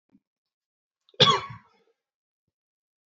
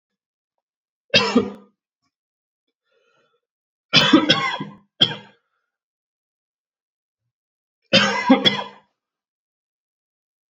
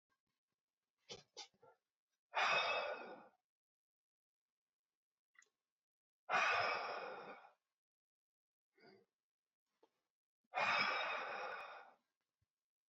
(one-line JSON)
{"cough_length": "3.1 s", "cough_amplitude": 26720, "cough_signal_mean_std_ratio": 0.2, "three_cough_length": "10.5 s", "three_cough_amplitude": 30863, "three_cough_signal_mean_std_ratio": 0.29, "exhalation_length": "12.9 s", "exhalation_amplitude": 1928, "exhalation_signal_mean_std_ratio": 0.37, "survey_phase": "alpha (2021-03-01 to 2021-08-12)", "age": "18-44", "gender": "Male", "wearing_mask": "No", "symptom_cough_any": true, "symptom_new_continuous_cough": true, "symptom_diarrhoea": true, "symptom_fatigue": true, "symptom_onset": "3 days", "smoker_status": "Never smoked", "respiratory_condition_asthma": false, "respiratory_condition_other": false, "recruitment_source": "Test and Trace", "submission_delay": "2 days", "covid_test_result": "Positive", "covid_test_method": "RT-qPCR", "covid_ct_value": 11.6, "covid_ct_gene": "ORF1ab gene", "covid_ct_mean": 12.0, "covid_viral_load": "120000000 copies/ml", "covid_viral_load_category": "High viral load (>1M copies/ml)"}